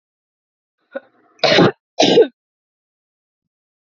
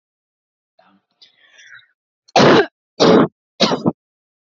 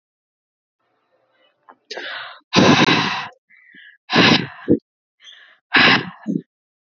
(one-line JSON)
{"cough_length": "3.8 s", "cough_amplitude": 31240, "cough_signal_mean_std_ratio": 0.31, "three_cough_length": "4.5 s", "three_cough_amplitude": 32767, "three_cough_signal_mean_std_ratio": 0.34, "exhalation_length": "6.9 s", "exhalation_amplitude": 32768, "exhalation_signal_mean_std_ratio": 0.39, "survey_phase": "beta (2021-08-13 to 2022-03-07)", "age": "18-44", "gender": "Female", "wearing_mask": "No", "symptom_none": true, "smoker_status": "Never smoked", "respiratory_condition_asthma": false, "respiratory_condition_other": false, "recruitment_source": "REACT", "submission_delay": "2 days", "covid_test_result": "Negative", "covid_test_method": "RT-qPCR", "influenza_a_test_result": "Negative", "influenza_b_test_result": "Negative"}